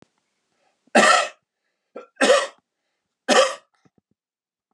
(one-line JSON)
{"three_cough_length": "4.7 s", "three_cough_amplitude": 26436, "three_cough_signal_mean_std_ratio": 0.33, "survey_phase": "beta (2021-08-13 to 2022-03-07)", "age": "45-64", "gender": "Male", "wearing_mask": "No", "symptom_none": true, "smoker_status": "Never smoked", "respiratory_condition_asthma": false, "respiratory_condition_other": false, "recruitment_source": "REACT", "submission_delay": "2 days", "covid_test_result": "Negative", "covid_test_method": "RT-qPCR", "influenza_a_test_result": "Unknown/Void", "influenza_b_test_result": "Unknown/Void"}